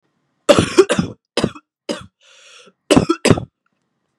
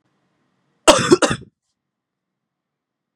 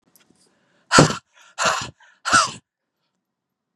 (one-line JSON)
{"three_cough_length": "4.2 s", "three_cough_amplitude": 32768, "three_cough_signal_mean_std_ratio": 0.34, "cough_length": "3.2 s", "cough_amplitude": 32768, "cough_signal_mean_std_ratio": 0.25, "exhalation_length": "3.8 s", "exhalation_amplitude": 32768, "exhalation_signal_mean_std_ratio": 0.31, "survey_phase": "beta (2021-08-13 to 2022-03-07)", "age": "18-44", "gender": "Female", "wearing_mask": "No", "symptom_cough_any": true, "symptom_runny_or_blocked_nose": true, "symptom_fatigue": true, "symptom_headache": true, "symptom_onset": "2 days", "smoker_status": "Never smoked", "respiratory_condition_asthma": false, "respiratory_condition_other": false, "recruitment_source": "Test and Trace", "submission_delay": "1 day", "covid_test_result": "Positive", "covid_test_method": "RT-qPCR"}